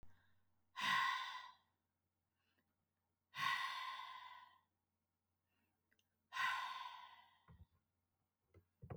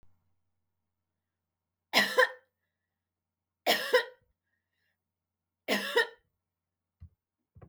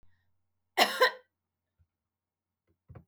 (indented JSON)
{
  "exhalation_length": "9.0 s",
  "exhalation_amplitude": 1651,
  "exhalation_signal_mean_std_ratio": 0.4,
  "three_cough_length": "7.7 s",
  "three_cough_amplitude": 9929,
  "three_cough_signal_mean_std_ratio": 0.26,
  "cough_length": "3.1 s",
  "cough_amplitude": 11319,
  "cough_signal_mean_std_ratio": 0.23,
  "survey_phase": "beta (2021-08-13 to 2022-03-07)",
  "age": "45-64",
  "gender": "Female",
  "wearing_mask": "No",
  "symptom_none": true,
  "smoker_status": "Never smoked",
  "respiratory_condition_asthma": false,
  "respiratory_condition_other": false,
  "recruitment_source": "REACT",
  "submission_delay": "2 days",
  "covid_test_result": "Negative",
  "covid_test_method": "RT-qPCR"
}